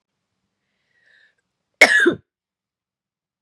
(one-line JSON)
{"cough_length": "3.4 s", "cough_amplitude": 32768, "cough_signal_mean_std_ratio": 0.23, "survey_phase": "beta (2021-08-13 to 2022-03-07)", "age": "45-64", "gender": "Female", "wearing_mask": "No", "symptom_cough_any": true, "symptom_runny_or_blocked_nose": true, "symptom_sore_throat": true, "symptom_other": true, "symptom_onset": "5 days", "smoker_status": "Never smoked", "respiratory_condition_asthma": false, "respiratory_condition_other": false, "recruitment_source": "Test and Trace", "submission_delay": "2 days", "covid_test_result": "Positive", "covid_test_method": "ePCR"}